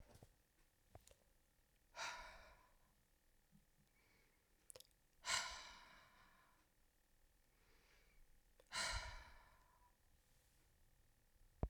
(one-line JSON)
{"exhalation_length": "11.7 s", "exhalation_amplitude": 1519, "exhalation_signal_mean_std_ratio": 0.34, "survey_phase": "beta (2021-08-13 to 2022-03-07)", "age": "18-44", "gender": "Female", "wearing_mask": "No", "symptom_cough_any": true, "symptom_runny_or_blocked_nose": true, "symptom_sore_throat": true, "symptom_fatigue": true, "symptom_headache": true, "symptom_loss_of_taste": true, "symptom_onset": "2 days", "smoker_status": "Never smoked", "respiratory_condition_asthma": false, "respiratory_condition_other": false, "recruitment_source": "Test and Trace", "submission_delay": "2 days", "covid_test_result": "Positive", "covid_test_method": "RT-qPCR"}